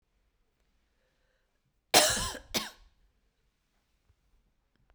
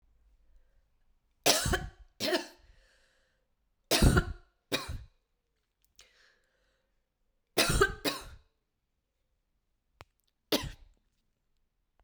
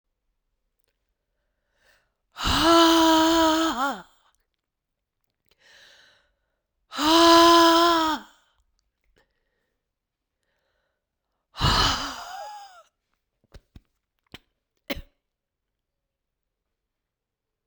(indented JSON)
{
  "cough_length": "4.9 s",
  "cough_amplitude": 15667,
  "cough_signal_mean_std_ratio": 0.22,
  "three_cough_length": "12.0 s",
  "three_cough_amplitude": 13624,
  "three_cough_signal_mean_std_ratio": 0.29,
  "exhalation_length": "17.7 s",
  "exhalation_amplitude": 20292,
  "exhalation_signal_mean_std_ratio": 0.36,
  "survey_phase": "beta (2021-08-13 to 2022-03-07)",
  "age": "45-64",
  "gender": "Male",
  "wearing_mask": "No",
  "symptom_cough_any": true,
  "symptom_new_continuous_cough": true,
  "symptom_runny_or_blocked_nose": true,
  "symptom_sore_throat": true,
  "symptom_abdominal_pain": true,
  "symptom_fever_high_temperature": true,
  "symptom_headache": true,
  "smoker_status": "Never smoked",
  "respiratory_condition_asthma": false,
  "respiratory_condition_other": false,
  "recruitment_source": "Test and Trace",
  "submission_delay": "2 days",
  "covid_test_result": "Positive",
  "covid_test_method": "LAMP"
}